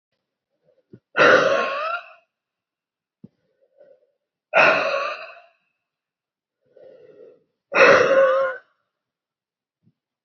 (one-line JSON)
{"exhalation_length": "10.2 s", "exhalation_amplitude": 28087, "exhalation_signal_mean_std_ratio": 0.36, "survey_phase": "beta (2021-08-13 to 2022-03-07)", "age": "18-44", "gender": "Female", "wearing_mask": "No", "symptom_cough_any": true, "symptom_runny_or_blocked_nose": true, "symptom_shortness_of_breath": true, "symptom_fatigue": true, "symptom_headache": true, "symptom_change_to_sense_of_smell_or_taste": true, "symptom_loss_of_taste": true, "symptom_onset": "4 days", "smoker_status": "Never smoked", "respiratory_condition_asthma": false, "respiratory_condition_other": false, "recruitment_source": "Test and Trace", "submission_delay": "2 days", "covid_test_result": "Positive", "covid_test_method": "RT-qPCR", "covid_ct_value": 13.5, "covid_ct_gene": "ORF1ab gene", "covid_ct_mean": 14.0, "covid_viral_load": "25000000 copies/ml", "covid_viral_load_category": "High viral load (>1M copies/ml)"}